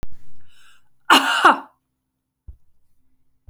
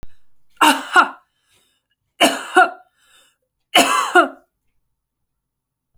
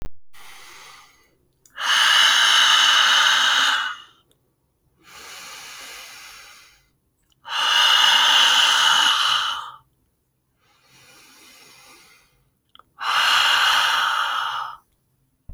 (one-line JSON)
{"cough_length": "3.5 s", "cough_amplitude": 30322, "cough_signal_mean_std_ratio": 0.39, "three_cough_length": "6.0 s", "three_cough_amplitude": 32578, "three_cough_signal_mean_std_ratio": 0.35, "exhalation_length": "15.5 s", "exhalation_amplitude": 23042, "exhalation_signal_mean_std_ratio": 0.57, "survey_phase": "alpha (2021-03-01 to 2021-08-12)", "age": "18-44", "gender": "Female", "wearing_mask": "No", "symptom_none": true, "smoker_status": "Never smoked", "respiratory_condition_asthma": true, "respiratory_condition_other": false, "recruitment_source": "Test and Trace", "submission_delay": "1 day", "covid_test_result": "Positive", "covid_test_method": "RT-qPCR"}